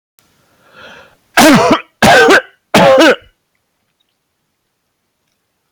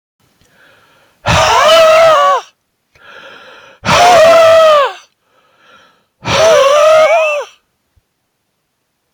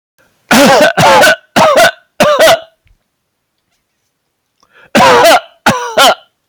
{"three_cough_length": "5.7 s", "three_cough_amplitude": 32768, "three_cough_signal_mean_std_ratio": 0.44, "exhalation_length": "9.1 s", "exhalation_amplitude": 32768, "exhalation_signal_mean_std_ratio": 0.6, "cough_length": "6.5 s", "cough_amplitude": 32768, "cough_signal_mean_std_ratio": 0.63, "survey_phase": "beta (2021-08-13 to 2022-03-07)", "age": "65+", "gender": "Male", "wearing_mask": "No", "symptom_none": true, "smoker_status": "Ex-smoker", "respiratory_condition_asthma": false, "respiratory_condition_other": false, "recruitment_source": "REACT", "submission_delay": "1 day", "covid_test_result": "Negative", "covid_test_method": "RT-qPCR"}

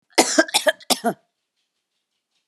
{"cough_length": "2.5 s", "cough_amplitude": 31380, "cough_signal_mean_std_ratio": 0.33, "survey_phase": "alpha (2021-03-01 to 2021-08-12)", "age": "65+", "gender": "Female", "wearing_mask": "No", "symptom_none": true, "symptom_onset": "2 days", "smoker_status": "Never smoked", "respiratory_condition_asthma": false, "respiratory_condition_other": false, "recruitment_source": "REACT", "submission_delay": "2 days", "covid_test_result": "Negative", "covid_test_method": "RT-qPCR"}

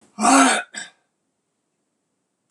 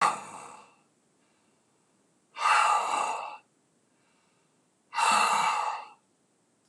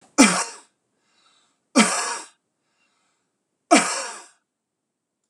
{"cough_length": "2.5 s", "cough_amplitude": 24851, "cough_signal_mean_std_ratio": 0.34, "exhalation_length": "6.7 s", "exhalation_amplitude": 9874, "exhalation_signal_mean_std_ratio": 0.45, "three_cough_length": "5.3 s", "three_cough_amplitude": 26027, "three_cough_signal_mean_std_ratio": 0.3, "survey_phase": "beta (2021-08-13 to 2022-03-07)", "age": "65+", "gender": "Male", "wearing_mask": "No", "symptom_none": true, "smoker_status": "Never smoked", "respiratory_condition_asthma": false, "respiratory_condition_other": false, "recruitment_source": "REACT", "submission_delay": "1 day", "covid_test_result": "Negative", "covid_test_method": "RT-qPCR"}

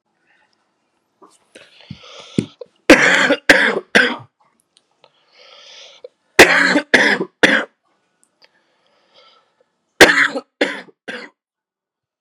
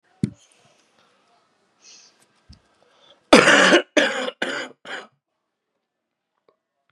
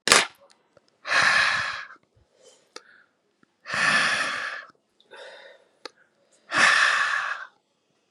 {"three_cough_length": "12.2 s", "three_cough_amplitude": 32768, "three_cough_signal_mean_std_ratio": 0.33, "cough_length": "6.9 s", "cough_amplitude": 32768, "cough_signal_mean_std_ratio": 0.28, "exhalation_length": "8.1 s", "exhalation_amplitude": 32768, "exhalation_signal_mean_std_ratio": 0.46, "survey_phase": "beta (2021-08-13 to 2022-03-07)", "age": "18-44", "gender": "Male", "wearing_mask": "No", "symptom_cough_any": true, "symptom_runny_or_blocked_nose": true, "symptom_sore_throat": true, "smoker_status": "Current smoker (11 or more cigarettes per day)", "respiratory_condition_asthma": false, "respiratory_condition_other": false, "recruitment_source": "REACT", "submission_delay": "2 days", "covid_test_result": "Negative", "covid_test_method": "RT-qPCR", "influenza_a_test_result": "Negative", "influenza_b_test_result": "Negative"}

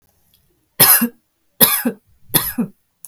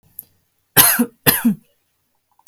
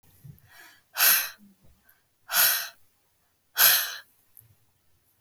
{"three_cough_length": "3.1 s", "three_cough_amplitude": 32768, "three_cough_signal_mean_std_ratio": 0.38, "cough_length": "2.5 s", "cough_amplitude": 32768, "cough_signal_mean_std_ratio": 0.36, "exhalation_length": "5.2 s", "exhalation_amplitude": 25256, "exhalation_signal_mean_std_ratio": 0.34, "survey_phase": "beta (2021-08-13 to 2022-03-07)", "age": "45-64", "gender": "Female", "wearing_mask": "No", "symptom_none": true, "smoker_status": "Never smoked", "respiratory_condition_asthma": false, "respiratory_condition_other": false, "recruitment_source": "REACT", "submission_delay": "9 days", "covid_test_result": "Negative", "covid_test_method": "RT-qPCR"}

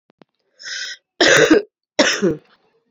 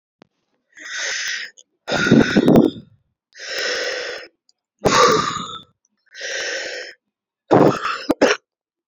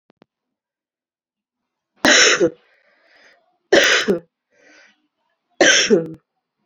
{"cough_length": "2.9 s", "cough_amplitude": 30747, "cough_signal_mean_std_ratio": 0.44, "exhalation_length": "8.9 s", "exhalation_amplitude": 32309, "exhalation_signal_mean_std_ratio": 0.47, "three_cough_length": "6.7 s", "three_cough_amplitude": 31222, "three_cough_signal_mean_std_ratio": 0.36, "survey_phase": "beta (2021-08-13 to 2022-03-07)", "age": "18-44", "gender": "Female", "wearing_mask": "No", "symptom_cough_any": true, "symptom_runny_or_blocked_nose": true, "symptom_abdominal_pain": true, "symptom_fatigue": true, "symptom_fever_high_temperature": true, "symptom_headache": true, "symptom_change_to_sense_of_smell_or_taste": true, "symptom_loss_of_taste": true, "symptom_onset": "5 days", "smoker_status": "Current smoker (11 or more cigarettes per day)", "respiratory_condition_asthma": true, "respiratory_condition_other": false, "recruitment_source": "Test and Trace", "submission_delay": "2 days", "covid_test_result": "Positive", "covid_test_method": "RT-qPCR", "covid_ct_value": 20.5, "covid_ct_gene": "ORF1ab gene", "covid_ct_mean": 21.1, "covid_viral_load": "120000 copies/ml", "covid_viral_load_category": "Low viral load (10K-1M copies/ml)"}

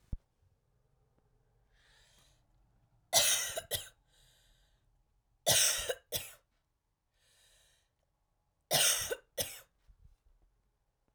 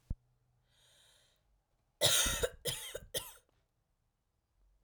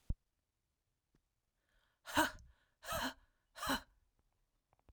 {"three_cough_length": "11.1 s", "three_cough_amplitude": 8193, "three_cough_signal_mean_std_ratio": 0.3, "cough_length": "4.8 s", "cough_amplitude": 6753, "cough_signal_mean_std_ratio": 0.32, "exhalation_length": "4.9 s", "exhalation_amplitude": 4173, "exhalation_signal_mean_std_ratio": 0.29, "survey_phase": "beta (2021-08-13 to 2022-03-07)", "age": "18-44", "gender": "Female", "wearing_mask": "No", "symptom_shortness_of_breath": true, "symptom_sore_throat": true, "symptom_fatigue": true, "symptom_headache": true, "symptom_change_to_sense_of_smell_or_taste": true, "smoker_status": "Never smoked", "respiratory_condition_asthma": false, "respiratory_condition_other": false, "recruitment_source": "Test and Trace", "submission_delay": "1 day", "covid_test_result": "Positive", "covid_test_method": "RT-qPCR", "covid_ct_value": 19.3, "covid_ct_gene": "ORF1ab gene", "covid_ct_mean": 19.6, "covid_viral_load": "360000 copies/ml", "covid_viral_load_category": "Low viral load (10K-1M copies/ml)"}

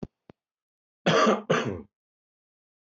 {"cough_length": "2.9 s", "cough_amplitude": 13019, "cough_signal_mean_std_ratio": 0.36, "survey_phase": "beta (2021-08-13 to 2022-03-07)", "age": "45-64", "gender": "Male", "wearing_mask": "No", "symptom_none": true, "symptom_onset": "11 days", "smoker_status": "Ex-smoker", "respiratory_condition_asthma": false, "respiratory_condition_other": false, "recruitment_source": "REACT", "submission_delay": "3 days", "covid_test_result": "Negative", "covid_test_method": "RT-qPCR", "influenza_a_test_result": "Negative", "influenza_b_test_result": "Negative"}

